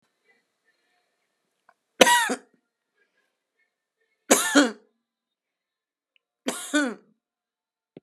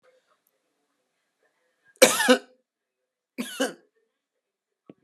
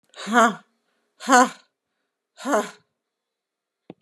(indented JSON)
{
  "three_cough_length": "8.0 s",
  "three_cough_amplitude": 32768,
  "three_cough_signal_mean_std_ratio": 0.25,
  "cough_length": "5.0 s",
  "cough_amplitude": 31167,
  "cough_signal_mean_std_ratio": 0.22,
  "exhalation_length": "4.0 s",
  "exhalation_amplitude": 29168,
  "exhalation_signal_mean_std_ratio": 0.31,
  "survey_phase": "beta (2021-08-13 to 2022-03-07)",
  "age": "65+",
  "gender": "Female",
  "wearing_mask": "No",
  "symptom_runny_or_blocked_nose": true,
  "smoker_status": "Never smoked",
  "respiratory_condition_asthma": false,
  "respiratory_condition_other": false,
  "recruitment_source": "REACT",
  "submission_delay": "2 days",
  "covid_test_result": "Negative",
  "covid_test_method": "RT-qPCR"
}